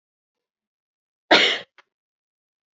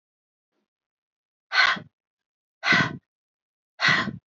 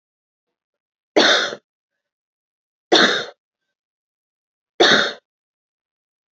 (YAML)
cough_length: 2.7 s
cough_amplitude: 28855
cough_signal_mean_std_ratio: 0.23
exhalation_length: 4.3 s
exhalation_amplitude: 15532
exhalation_signal_mean_std_ratio: 0.34
three_cough_length: 6.3 s
three_cough_amplitude: 30068
three_cough_signal_mean_std_ratio: 0.3
survey_phase: beta (2021-08-13 to 2022-03-07)
age: 18-44
gender: Female
wearing_mask: 'No'
symptom_cough_any: true
symptom_runny_or_blocked_nose: true
symptom_sore_throat: true
symptom_fatigue: true
symptom_change_to_sense_of_smell_or_taste: true
symptom_other: true
symptom_onset: 2 days
smoker_status: Never smoked
respiratory_condition_asthma: false
respiratory_condition_other: false
recruitment_source: Test and Trace
submission_delay: 1 day
covid_test_result: Positive
covid_test_method: RT-qPCR
covid_ct_value: 19.1
covid_ct_gene: ORF1ab gene